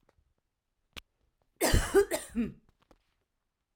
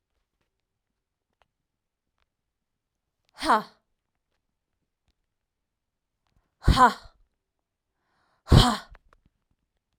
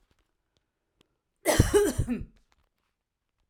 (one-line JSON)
{"three_cough_length": "3.8 s", "three_cough_amplitude": 9808, "three_cough_signal_mean_std_ratio": 0.31, "exhalation_length": "10.0 s", "exhalation_amplitude": 25231, "exhalation_signal_mean_std_ratio": 0.19, "cough_length": "3.5 s", "cough_amplitude": 17150, "cough_signal_mean_std_ratio": 0.33, "survey_phase": "alpha (2021-03-01 to 2021-08-12)", "age": "45-64", "gender": "Female", "wearing_mask": "No", "symptom_none": true, "smoker_status": "Never smoked", "respiratory_condition_asthma": false, "respiratory_condition_other": false, "recruitment_source": "REACT", "submission_delay": "2 days", "covid_test_result": "Negative", "covid_test_method": "RT-qPCR"}